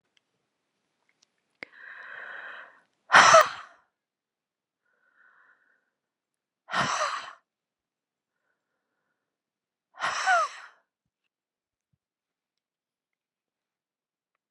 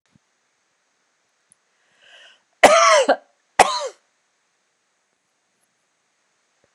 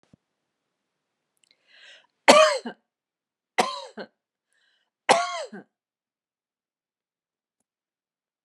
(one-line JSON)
{"exhalation_length": "14.5 s", "exhalation_amplitude": 26356, "exhalation_signal_mean_std_ratio": 0.21, "cough_length": "6.7 s", "cough_amplitude": 32768, "cough_signal_mean_std_ratio": 0.25, "three_cough_length": "8.4 s", "three_cough_amplitude": 31413, "three_cough_signal_mean_std_ratio": 0.21, "survey_phase": "alpha (2021-03-01 to 2021-08-12)", "age": "65+", "gender": "Female", "wearing_mask": "No", "symptom_none": true, "smoker_status": "Ex-smoker", "respiratory_condition_asthma": false, "respiratory_condition_other": false, "recruitment_source": "REACT", "submission_delay": "2 days", "covid_test_result": "Negative", "covid_test_method": "RT-qPCR"}